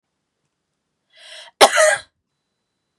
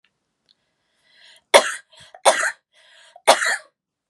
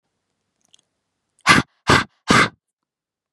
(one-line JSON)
{"cough_length": "3.0 s", "cough_amplitude": 32768, "cough_signal_mean_std_ratio": 0.26, "three_cough_length": "4.1 s", "three_cough_amplitude": 32768, "three_cough_signal_mean_std_ratio": 0.28, "exhalation_length": "3.3 s", "exhalation_amplitude": 32768, "exhalation_signal_mean_std_ratio": 0.3, "survey_phase": "beta (2021-08-13 to 2022-03-07)", "age": "18-44", "gender": "Female", "wearing_mask": "No", "symptom_shortness_of_breath": true, "symptom_fever_high_temperature": true, "symptom_onset": "6 days", "smoker_status": "Never smoked", "respiratory_condition_asthma": true, "respiratory_condition_other": false, "recruitment_source": "Test and Trace", "submission_delay": "3 days", "covid_test_result": "Positive", "covid_test_method": "RT-qPCR", "covid_ct_value": 28.2, "covid_ct_gene": "N gene"}